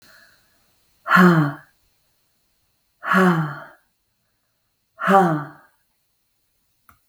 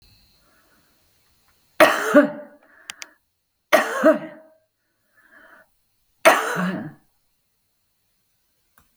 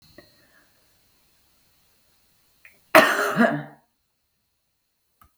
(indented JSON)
{
  "exhalation_length": "7.1 s",
  "exhalation_amplitude": 31862,
  "exhalation_signal_mean_std_ratio": 0.35,
  "three_cough_length": "9.0 s",
  "three_cough_amplitude": 32768,
  "three_cough_signal_mean_std_ratio": 0.29,
  "cough_length": "5.4 s",
  "cough_amplitude": 32768,
  "cough_signal_mean_std_ratio": 0.24,
  "survey_phase": "beta (2021-08-13 to 2022-03-07)",
  "age": "65+",
  "gender": "Female",
  "wearing_mask": "No",
  "symptom_none": true,
  "smoker_status": "Current smoker (11 or more cigarettes per day)",
  "respiratory_condition_asthma": false,
  "respiratory_condition_other": false,
  "recruitment_source": "REACT",
  "submission_delay": "2 days",
  "covid_test_result": "Negative",
  "covid_test_method": "RT-qPCR",
  "influenza_a_test_result": "Negative",
  "influenza_b_test_result": "Negative"
}